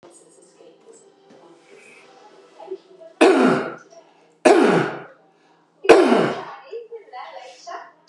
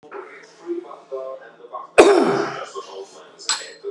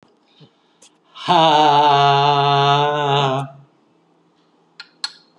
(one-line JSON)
{"three_cough_length": "8.1 s", "three_cough_amplitude": 32768, "three_cough_signal_mean_std_ratio": 0.37, "cough_length": "3.9 s", "cough_amplitude": 32768, "cough_signal_mean_std_ratio": 0.41, "exhalation_length": "5.4 s", "exhalation_amplitude": 27070, "exhalation_signal_mean_std_ratio": 0.59, "survey_phase": "beta (2021-08-13 to 2022-03-07)", "age": "65+", "gender": "Male", "wearing_mask": "No", "symptom_none": true, "smoker_status": "Ex-smoker", "respiratory_condition_asthma": false, "respiratory_condition_other": false, "recruitment_source": "REACT", "submission_delay": "3 days", "covid_test_result": "Negative", "covid_test_method": "RT-qPCR"}